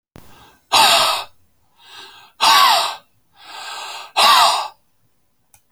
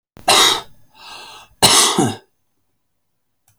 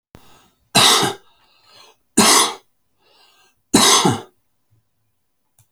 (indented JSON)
{
  "exhalation_length": "5.7 s",
  "exhalation_amplitude": 32768,
  "exhalation_signal_mean_std_ratio": 0.46,
  "cough_length": "3.6 s",
  "cough_amplitude": 32768,
  "cough_signal_mean_std_ratio": 0.4,
  "three_cough_length": "5.7 s",
  "three_cough_amplitude": 32768,
  "three_cough_signal_mean_std_ratio": 0.37,
  "survey_phase": "alpha (2021-03-01 to 2021-08-12)",
  "age": "65+",
  "gender": "Male",
  "wearing_mask": "No",
  "symptom_none": true,
  "smoker_status": "Never smoked",
  "respiratory_condition_asthma": true,
  "respiratory_condition_other": false,
  "recruitment_source": "REACT",
  "submission_delay": "2 days",
  "covid_test_result": "Negative",
  "covid_test_method": "RT-qPCR"
}